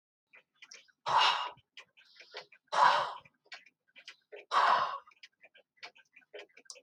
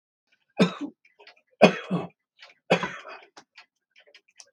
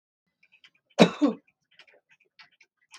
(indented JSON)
{
  "exhalation_length": "6.8 s",
  "exhalation_amplitude": 7940,
  "exhalation_signal_mean_std_ratio": 0.36,
  "three_cough_length": "4.5 s",
  "three_cough_amplitude": 31153,
  "three_cough_signal_mean_std_ratio": 0.26,
  "cough_length": "3.0 s",
  "cough_amplitude": 29628,
  "cough_signal_mean_std_ratio": 0.2,
  "survey_phase": "beta (2021-08-13 to 2022-03-07)",
  "age": "65+",
  "gender": "Male",
  "wearing_mask": "No",
  "symptom_none": true,
  "smoker_status": "Ex-smoker",
  "respiratory_condition_asthma": true,
  "respiratory_condition_other": true,
  "recruitment_source": "REACT",
  "submission_delay": "2 days",
  "covid_test_result": "Negative",
  "covid_test_method": "RT-qPCR",
  "influenza_a_test_result": "Negative",
  "influenza_b_test_result": "Negative"
}